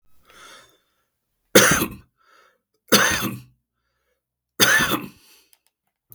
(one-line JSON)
{"three_cough_length": "6.1 s", "three_cough_amplitude": 32768, "three_cough_signal_mean_std_ratio": 0.33, "survey_phase": "beta (2021-08-13 to 2022-03-07)", "age": "65+", "gender": "Male", "wearing_mask": "No", "symptom_runny_or_blocked_nose": true, "symptom_other": true, "smoker_status": "Current smoker (1 to 10 cigarettes per day)", "respiratory_condition_asthma": false, "respiratory_condition_other": false, "recruitment_source": "REACT", "submission_delay": "3 days", "covid_test_result": "Negative", "covid_test_method": "RT-qPCR", "influenza_a_test_result": "Negative", "influenza_b_test_result": "Negative"}